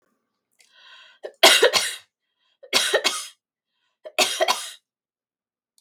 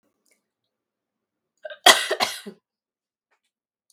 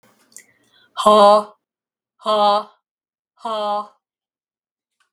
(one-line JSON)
{"three_cough_length": "5.8 s", "three_cough_amplitude": 32767, "three_cough_signal_mean_std_ratio": 0.34, "cough_length": "3.9 s", "cough_amplitude": 32768, "cough_signal_mean_std_ratio": 0.2, "exhalation_length": "5.1 s", "exhalation_amplitude": 32768, "exhalation_signal_mean_std_ratio": 0.36, "survey_phase": "beta (2021-08-13 to 2022-03-07)", "age": "45-64", "gender": "Female", "wearing_mask": "No", "symptom_none": true, "smoker_status": "Never smoked", "respiratory_condition_asthma": false, "respiratory_condition_other": false, "recruitment_source": "REACT", "submission_delay": "2 days", "covid_test_result": "Negative", "covid_test_method": "RT-qPCR", "influenza_a_test_result": "Negative", "influenza_b_test_result": "Negative"}